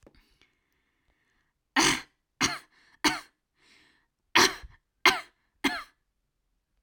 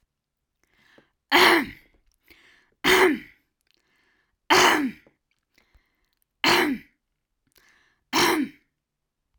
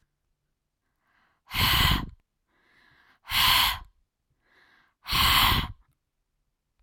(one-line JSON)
{"three_cough_length": "6.8 s", "three_cough_amplitude": 22518, "three_cough_signal_mean_std_ratio": 0.27, "cough_length": "9.4 s", "cough_amplitude": 24319, "cough_signal_mean_std_ratio": 0.35, "exhalation_length": "6.8 s", "exhalation_amplitude": 12008, "exhalation_signal_mean_std_ratio": 0.4, "survey_phase": "alpha (2021-03-01 to 2021-08-12)", "age": "18-44", "gender": "Female", "wearing_mask": "No", "symptom_none": true, "symptom_onset": "4 days", "smoker_status": "Never smoked", "respiratory_condition_asthma": false, "respiratory_condition_other": false, "recruitment_source": "REACT", "submission_delay": "1 day", "covid_test_result": "Negative", "covid_test_method": "RT-qPCR"}